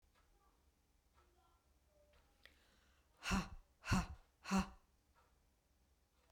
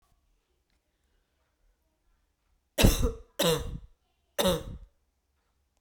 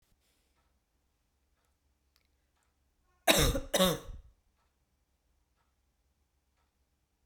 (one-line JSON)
{"exhalation_length": "6.3 s", "exhalation_amplitude": 1917, "exhalation_signal_mean_std_ratio": 0.28, "three_cough_length": "5.8 s", "three_cough_amplitude": 13617, "three_cough_signal_mean_std_ratio": 0.3, "cough_length": "7.3 s", "cough_amplitude": 11589, "cough_signal_mean_std_ratio": 0.23, "survey_phase": "beta (2021-08-13 to 2022-03-07)", "age": "18-44", "gender": "Female", "wearing_mask": "No", "symptom_none": true, "smoker_status": "Never smoked", "respiratory_condition_asthma": false, "respiratory_condition_other": false, "recruitment_source": "REACT", "submission_delay": "4 days", "covid_test_result": "Negative", "covid_test_method": "RT-qPCR", "influenza_a_test_result": "Negative", "influenza_b_test_result": "Negative"}